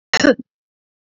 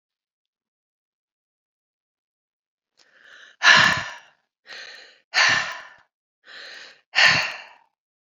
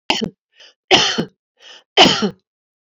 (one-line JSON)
{"cough_length": "1.1 s", "cough_amplitude": 27509, "cough_signal_mean_std_ratio": 0.31, "exhalation_length": "8.3 s", "exhalation_amplitude": 27991, "exhalation_signal_mean_std_ratio": 0.3, "three_cough_length": "2.9 s", "three_cough_amplitude": 30932, "three_cough_signal_mean_std_ratio": 0.39, "survey_phase": "alpha (2021-03-01 to 2021-08-12)", "age": "65+", "gender": "Female", "wearing_mask": "No", "symptom_cough_any": true, "symptom_headache": true, "symptom_onset": "7 days", "smoker_status": "Never smoked", "respiratory_condition_asthma": false, "respiratory_condition_other": false, "recruitment_source": "Test and Trace", "submission_delay": "2 days", "covid_test_result": "Positive", "covid_test_method": "RT-qPCR", "covid_ct_value": 18.1, "covid_ct_gene": "ORF1ab gene", "covid_ct_mean": 18.3, "covid_viral_load": "980000 copies/ml", "covid_viral_load_category": "Low viral load (10K-1M copies/ml)"}